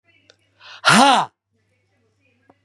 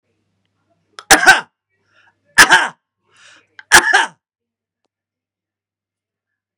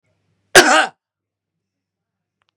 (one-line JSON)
{"exhalation_length": "2.6 s", "exhalation_amplitude": 31726, "exhalation_signal_mean_std_ratio": 0.31, "three_cough_length": "6.6 s", "three_cough_amplitude": 32768, "three_cough_signal_mean_std_ratio": 0.27, "cough_length": "2.6 s", "cough_amplitude": 32768, "cough_signal_mean_std_ratio": 0.26, "survey_phase": "beta (2021-08-13 to 2022-03-07)", "age": "18-44", "gender": "Male", "wearing_mask": "No", "symptom_cough_any": true, "smoker_status": "Ex-smoker", "respiratory_condition_asthma": false, "respiratory_condition_other": false, "recruitment_source": "REACT", "submission_delay": "0 days", "covid_test_result": "Negative", "covid_test_method": "RT-qPCR", "influenza_a_test_result": "Negative", "influenza_b_test_result": "Negative"}